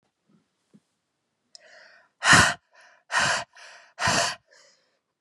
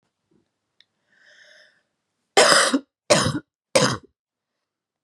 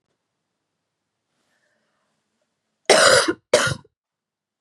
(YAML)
exhalation_length: 5.2 s
exhalation_amplitude: 27492
exhalation_signal_mean_std_ratio: 0.32
three_cough_length: 5.0 s
three_cough_amplitude: 32767
three_cough_signal_mean_std_ratio: 0.32
cough_length: 4.6 s
cough_amplitude: 31798
cough_signal_mean_std_ratio: 0.28
survey_phase: beta (2021-08-13 to 2022-03-07)
age: 18-44
gender: Female
wearing_mask: 'No'
symptom_cough_any: true
symptom_runny_or_blocked_nose: true
symptom_shortness_of_breath: true
symptom_sore_throat: true
symptom_abdominal_pain: true
symptom_fatigue: true
symptom_fever_high_temperature: true
symptom_headache: true
symptom_change_to_sense_of_smell_or_taste: true
symptom_loss_of_taste: true
symptom_onset: 3 days
smoker_status: Never smoked
respiratory_condition_asthma: false
respiratory_condition_other: false
recruitment_source: Test and Trace
submission_delay: 1 day
covid_test_result: Positive
covid_test_method: RT-qPCR
covid_ct_value: 19.0
covid_ct_gene: ORF1ab gene
covid_ct_mean: 19.9
covid_viral_load: 300000 copies/ml
covid_viral_load_category: Low viral load (10K-1M copies/ml)